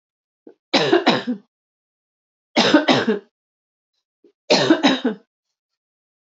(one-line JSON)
{"three_cough_length": "6.3 s", "three_cough_amplitude": 26644, "three_cough_signal_mean_std_ratio": 0.4, "survey_phase": "beta (2021-08-13 to 2022-03-07)", "age": "18-44", "gender": "Female", "wearing_mask": "No", "symptom_cough_any": true, "symptom_runny_or_blocked_nose": true, "symptom_onset": "7 days", "smoker_status": "Never smoked", "respiratory_condition_asthma": false, "respiratory_condition_other": false, "recruitment_source": "Test and Trace", "submission_delay": "2 days", "covid_test_result": "Negative", "covid_test_method": "RT-qPCR"}